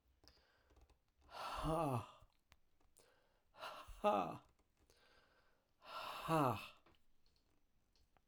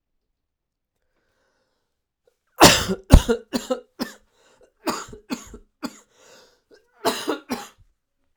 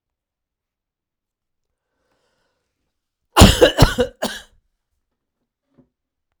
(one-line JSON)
{"exhalation_length": "8.3 s", "exhalation_amplitude": 2400, "exhalation_signal_mean_std_ratio": 0.37, "three_cough_length": "8.4 s", "three_cough_amplitude": 32768, "three_cough_signal_mean_std_ratio": 0.24, "cough_length": "6.4 s", "cough_amplitude": 32768, "cough_signal_mean_std_ratio": 0.22, "survey_phase": "beta (2021-08-13 to 2022-03-07)", "age": "45-64", "gender": "Male", "wearing_mask": "No", "symptom_cough_any": true, "symptom_shortness_of_breath": true, "symptom_diarrhoea": true, "symptom_fatigue": true, "symptom_fever_high_temperature": true, "symptom_headache": true, "symptom_onset": "3 days", "smoker_status": "Ex-smoker", "respiratory_condition_asthma": false, "respiratory_condition_other": false, "recruitment_source": "Test and Trace", "submission_delay": "1 day", "covid_test_result": "Positive", "covid_test_method": "ePCR"}